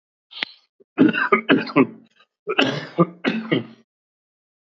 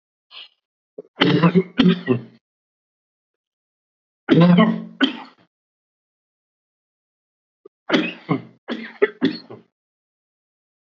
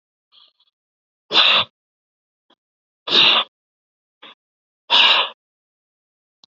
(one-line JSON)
{"cough_length": "4.8 s", "cough_amplitude": 27076, "cough_signal_mean_std_ratio": 0.41, "three_cough_length": "10.9 s", "three_cough_amplitude": 29467, "three_cough_signal_mean_std_ratio": 0.33, "exhalation_length": "6.5 s", "exhalation_amplitude": 29557, "exhalation_signal_mean_std_ratio": 0.32, "survey_phase": "alpha (2021-03-01 to 2021-08-12)", "age": "45-64", "gender": "Male", "wearing_mask": "No", "symptom_none": true, "smoker_status": "Ex-smoker", "respiratory_condition_asthma": true, "respiratory_condition_other": false, "recruitment_source": "REACT", "submission_delay": "3 days", "covid_test_result": "Negative", "covid_test_method": "RT-qPCR"}